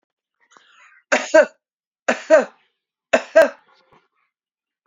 {"three_cough_length": "4.9 s", "three_cough_amplitude": 28631, "three_cough_signal_mean_std_ratio": 0.28, "survey_phase": "beta (2021-08-13 to 2022-03-07)", "age": "45-64", "gender": "Male", "wearing_mask": "No", "symptom_none": true, "smoker_status": "Never smoked", "respiratory_condition_asthma": true, "respiratory_condition_other": false, "recruitment_source": "REACT", "submission_delay": "1 day", "covid_test_result": "Negative", "covid_test_method": "RT-qPCR"}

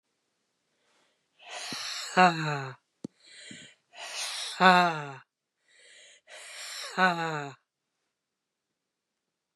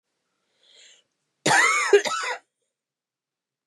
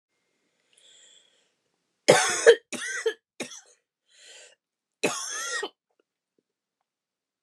{"exhalation_length": "9.6 s", "exhalation_amplitude": 17682, "exhalation_signal_mean_std_ratio": 0.32, "cough_length": "3.7 s", "cough_amplitude": 19072, "cough_signal_mean_std_ratio": 0.36, "three_cough_length": "7.4 s", "three_cough_amplitude": 26785, "three_cough_signal_mean_std_ratio": 0.26, "survey_phase": "beta (2021-08-13 to 2022-03-07)", "age": "45-64", "gender": "Female", "wearing_mask": "No", "symptom_cough_any": true, "symptom_runny_or_blocked_nose": true, "symptom_sore_throat": true, "symptom_fatigue": true, "symptom_headache": true, "symptom_onset": "4 days", "smoker_status": "Never smoked", "respiratory_condition_asthma": false, "respiratory_condition_other": false, "recruitment_source": "Test and Trace", "submission_delay": "1 day", "covid_test_result": "Positive", "covid_test_method": "RT-qPCR", "covid_ct_value": 12.5, "covid_ct_gene": "ORF1ab gene"}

